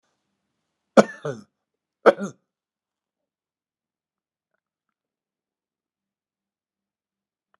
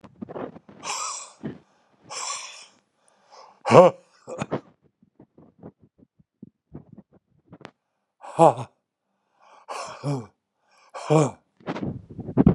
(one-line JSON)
{"cough_length": "7.6 s", "cough_amplitude": 32768, "cough_signal_mean_std_ratio": 0.12, "exhalation_length": "12.5 s", "exhalation_amplitude": 31796, "exhalation_signal_mean_std_ratio": 0.26, "survey_phase": "alpha (2021-03-01 to 2021-08-12)", "age": "65+", "gender": "Male", "wearing_mask": "No", "symptom_none": true, "smoker_status": "Never smoked", "respiratory_condition_asthma": false, "respiratory_condition_other": false, "recruitment_source": "REACT", "submission_delay": "1 day", "covid_test_result": "Negative", "covid_test_method": "RT-qPCR"}